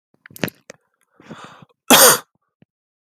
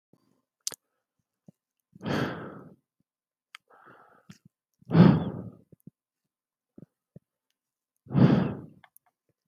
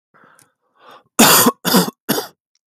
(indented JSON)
{
  "cough_length": "3.2 s",
  "cough_amplitude": 32768,
  "cough_signal_mean_std_ratio": 0.26,
  "exhalation_length": "9.5 s",
  "exhalation_amplitude": 19052,
  "exhalation_signal_mean_std_ratio": 0.25,
  "three_cough_length": "2.7 s",
  "three_cough_amplitude": 32768,
  "three_cough_signal_mean_std_ratio": 0.41,
  "survey_phase": "beta (2021-08-13 to 2022-03-07)",
  "age": "18-44",
  "gender": "Male",
  "wearing_mask": "No",
  "symptom_none": true,
  "smoker_status": "Current smoker (1 to 10 cigarettes per day)",
  "respiratory_condition_asthma": false,
  "respiratory_condition_other": false,
  "recruitment_source": "REACT",
  "submission_delay": "3 days",
  "covid_test_result": "Negative",
  "covid_test_method": "RT-qPCR"
}